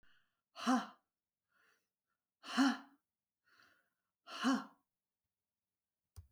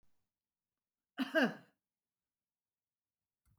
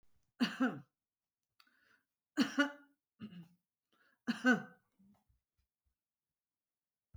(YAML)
exhalation_length: 6.3 s
exhalation_amplitude: 3232
exhalation_signal_mean_std_ratio: 0.28
cough_length: 3.6 s
cough_amplitude: 4122
cough_signal_mean_std_ratio: 0.21
three_cough_length: 7.2 s
three_cough_amplitude: 5149
three_cough_signal_mean_std_ratio: 0.26
survey_phase: beta (2021-08-13 to 2022-03-07)
age: 65+
gender: Female
wearing_mask: 'No'
symptom_none: true
smoker_status: Never smoked
respiratory_condition_asthma: false
respiratory_condition_other: false
recruitment_source: REACT
submission_delay: 5 days
covid_test_result: Negative
covid_test_method: RT-qPCR